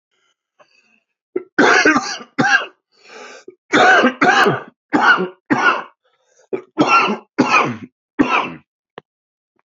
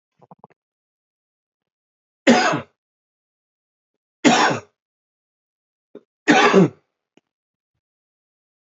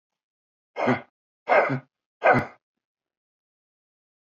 {"cough_length": "9.7 s", "cough_amplitude": 28954, "cough_signal_mean_std_ratio": 0.49, "three_cough_length": "8.8 s", "three_cough_amplitude": 28037, "three_cough_signal_mean_std_ratio": 0.27, "exhalation_length": "4.3 s", "exhalation_amplitude": 16253, "exhalation_signal_mean_std_ratio": 0.31, "survey_phase": "beta (2021-08-13 to 2022-03-07)", "age": "45-64", "gender": "Male", "wearing_mask": "No", "symptom_cough_any": true, "symptom_fatigue": true, "symptom_headache": true, "symptom_change_to_sense_of_smell_or_taste": true, "symptom_loss_of_taste": true, "symptom_onset": "2 days", "smoker_status": "Never smoked", "respiratory_condition_asthma": false, "respiratory_condition_other": false, "recruitment_source": "Test and Trace", "submission_delay": "1 day", "covid_test_result": "Positive", "covid_test_method": "RT-qPCR", "covid_ct_value": 20.3, "covid_ct_gene": "N gene"}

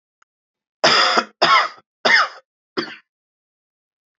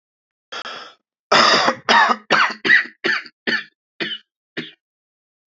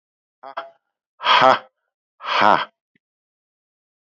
{"three_cough_length": "4.2 s", "three_cough_amplitude": 29313, "three_cough_signal_mean_std_ratio": 0.39, "cough_length": "5.5 s", "cough_amplitude": 29018, "cough_signal_mean_std_ratio": 0.44, "exhalation_length": "4.0 s", "exhalation_amplitude": 28405, "exhalation_signal_mean_std_ratio": 0.31, "survey_phase": "beta (2021-08-13 to 2022-03-07)", "age": "45-64", "gender": "Male", "wearing_mask": "No", "symptom_cough_any": true, "symptom_runny_or_blocked_nose": true, "symptom_sore_throat": true, "symptom_fatigue": true, "symptom_headache": true, "symptom_loss_of_taste": true, "symptom_other": true, "symptom_onset": "3 days", "smoker_status": "Never smoked", "respiratory_condition_asthma": false, "respiratory_condition_other": false, "recruitment_source": "Test and Trace", "submission_delay": "2 days", "covid_test_result": "Positive", "covid_test_method": "RT-qPCR", "covid_ct_value": 14.8, "covid_ct_gene": "ORF1ab gene", "covid_ct_mean": 15.2, "covid_viral_load": "11000000 copies/ml", "covid_viral_load_category": "High viral load (>1M copies/ml)"}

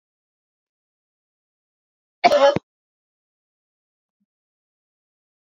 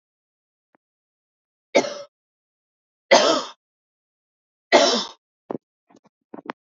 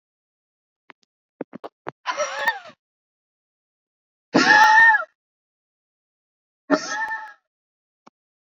{"cough_length": "5.5 s", "cough_amplitude": 28219, "cough_signal_mean_std_ratio": 0.18, "three_cough_length": "6.7 s", "three_cough_amplitude": 27408, "three_cough_signal_mean_std_ratio": 0.26, "exhalation_length": "8.4 s", "exhalation_amplitude": 25408, "exhalation_signal_mean_std_ratio": 0.31, "survey_phase": "beta (2021-08-13 to 2022-03-07)", "age": "45-64", "gender": "Female", "wearing_mask": "No", "symptom_none": true, "smoker_status": "Ex-smoker", "respiratory_condition_asthma": true, "respiratory_condition_other": false, "recruitment_source": "REACT", "submission_delay": "2 days", "covid_test_result": "Negative", "covid_test_method": "RT-qPCR", "influenza_a_test_result": "Negative", "influenza_b_test_result": "Negative"}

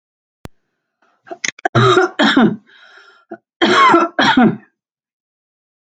{"cough_length": "6.0 s", "cough_amplitude": 31714, "cough_signal_mean_std_ratio": 0.44, "survey_phase": "alpha (2021-03-01 to 2021-08-12)", "age": "45-64", "gender": "Female", "wearing_mask": "No", "symptom_none": true, "smoker_status": "Never smoked", "respiratory_condition_asthma": false, "respiratory_condition_other": false, "recruitment_source": "REACT", "submission_delay": "0 days", "covid_test_result": "Negative", "covid_test_method": "RT-qPCR"}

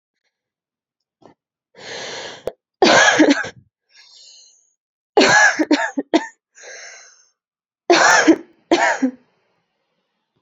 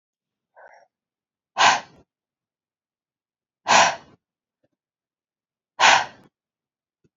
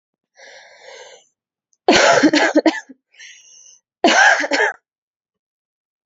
{"three_cough_length": "10.4 s", "three_cough_amplitude": 29347, "three_cough_signal_mean_std_ratio": 0.39, "exhalation_length": "7.2 s", "exhalation_amplitude": 26057, "exhalation_signal_mean_std_ratio": 0.25, "cough_length": "6.1 s", "cough_amplitude": 31578, "cough_signal_mean_std_ratio": 0.4, "survey_phase": "beta (2021-08-13 to 2022-03-07)", "age": "18-44", "gender": "Female", "wearing_mask": "No", "symptom_headache": true, "smoker_status": "Never smoked", "respiratory_condition_asthma": true, "respiratory_condition_other": false, "recruitment_source": "REACT", "submission_delay": "2 days", "covid_test_result": "Negative", "covid_test_method": "RT-qPCR"}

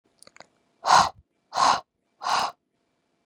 {"exhalation_length": "3.3 s", "exhalation_amplitude": 19450, "exhalation_signal_mean_std_ratio": 0.35, "survey_phase": "beta (2021-08-13 to 2022-03-07)", "age": "18-44", "gender": "Female", "wearing_mask": "No", "symptom_runny_or_blocked_nose": true, "symptom_fatigue": true, "symptom_headache": true, "smoker_status": "Ex-smoker", "respiratory_condition_asthma": false, "respiratory_condition_other": false, "recruitment_source": "Test and Trace", "submission_delay": "1 day", "covid_test_result": "Positive", "covid_test_method": "RT-qPCR", "covid_ct_value": 19.5, "covid_ct_gene": "ORF1ab gene"}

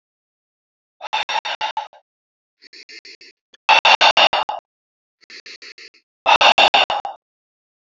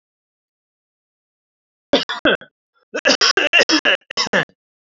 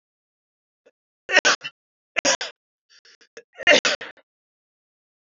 {"exhalation_length": "7.9 s", "exhalation_amplitude": 32768, "exhalation_signal_mean_std_ratio": 0.35, "cough_length": "4.9 s", "cough_amplitude": 28888, "cough_signal_mean_std_ratio": 0.38, "three_cough_length": "5.3 s", "three_cough_amplitude": 28142, "three_cough_signal_mean_std_ratio": 0.26, "survey_phase": "alpha (2021-03-01 to 2021-08-12)", "age": "18-44", "gender": "Male", "wearing_mask": "No", "symptom_none": true, "smoker_status": "Never smoked", "respiratory_condition_asthma": false, "respiratory_condition_other": false, "recruitment_source": "REACT", "submission_delay": "1 day", "covid_test_result": "Negative", "covid_test_method": "RT-qPCR"}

